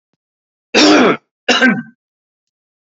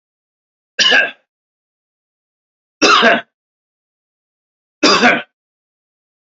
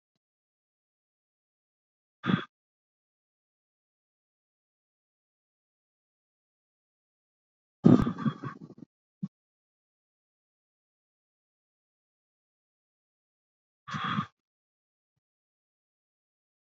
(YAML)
cough_length: 3.0 s
cough_amplitude: 30584
cough_signal_mean_std_ratio: 0.42
three_cough_length: 6.2 s
three_cough_amplitude: 30802
three_cough_signal_mean_std_ratio: 0.34
exhalation_length: 16.6 s
exhalation_amplitude: 19772
exhalation_signal_mean_std_ratio: 0.15
survey_phase: beta (2021-08-13 to 2022-03-07)
age: 18-44
gender: Male
wearing_mask: 'No'
symptom_none: true
smoker_status: Never smoked
respiratory_condition_asthma: false
respiratory_condition_other: false
recruitment_source: Test and Trace
submission_delay: 2 days
covid_test_result: Positive
covid_test_method: RT-qPCR
covid_ct_value: 20.2
covid_ct_gene: ORF1ab gene
covid_ct_mean: 20.7
covid_viral_load: 160000 copies/ml
covid_viral_load_category: Low viral load (10K-1M copies/ml)